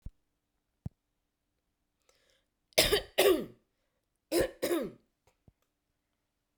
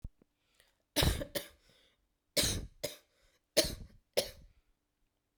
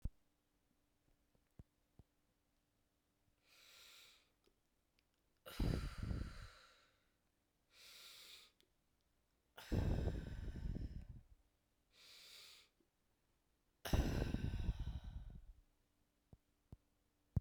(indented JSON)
{
  "cough_length": "6.6 s",
  "cough_amplitude": 13505,
  "cough_signal_mean_std_ratio": 0.29,
  "three_cough_length": "5.4 s",
  "three_cough_amplitude": 9495,
  "three_cough_signal_mean_std_ratio": 0.33,
  "exhalation_length": "17.4 s",
  "exhalation_amplitude": 2030,
  "exhalation_signal_mean_std_ratio": 0.37,
  "survey_phase": "beta (2021-08-13 to 2022-03-07)",
  "age": "45-64",
  "gender": "Female",
  "wearing_mask": "No",
  "symptom_none": true,
  "smoker_status": "Never smoked",
  "respiratory_condition_asthma": false,
  "respiratory_condition_other": false,
  "recruitment_source": "REACT",
  "submission_delay": "1 day",
  "covid_test_result": "Negative",
  "covid_test_method": "RT-qPCR"
}